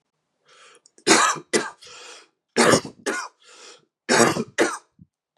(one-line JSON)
{"three_cough_length": "5.4 s", "three_cough_amplitude": 31191, "three_cough_signal_mean_std_ratio": 0.4, "survey_phase": "beta (2021-08-13 to 2022-03-07)", "age": "18-44", "gender": "Male", "wearing_mask": "No", "symptom_cough_any": true, "symptom_runny_or_blocked_nose": true, "symptom_sore_throat": true, "symptom_diarrhoea": true, "symptom_fatigue": true, "symptom_onset": "3 days", "smoker_status": "Never smoked", "respiratory_condition_asthma": false, "respiratory_condition_other": false, "recruitment_source": "Test and Trace", "submission_delay": "2 days", "covid_test_result": "Positive", "covid_test_method": "ePCR"}